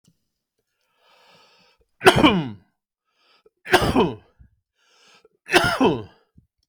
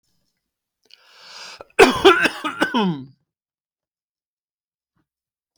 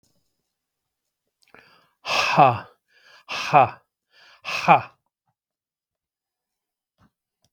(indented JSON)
{
  "three_cough_length": "6.7 s",
  "three_cough_amplitude": 32768,
  "three_cough_signal_mean_std_ratio": 0.33,
  "cough_length": "5.6 s",
  "cough_amplitude": 32768,
  "cough_signal_mean_std_ratio": 0.29,
  "exhalation_length": "7.5 s",
  "exhalation_amplitude": 31549,
  "exhalation_signal_mean_std_ratio": 0.26,
  "survey_phase": "beta (2021-08-13 to 2022-03-07)",
  "age": "45-64",
  "gender": "Male",
  "wearing_mask": "No",
  "symptom_none": true,
  "smoker_status": "Ex-smoker",
  "respiratory_condition_asthma": false,
  "respiratory_condition_other": false,
  "recruitment_source": "REACT",
  "submission_delay": "1 day",
  "covid_test_result": "Negative",
  "covid_test_method": "RT-qPCR"
}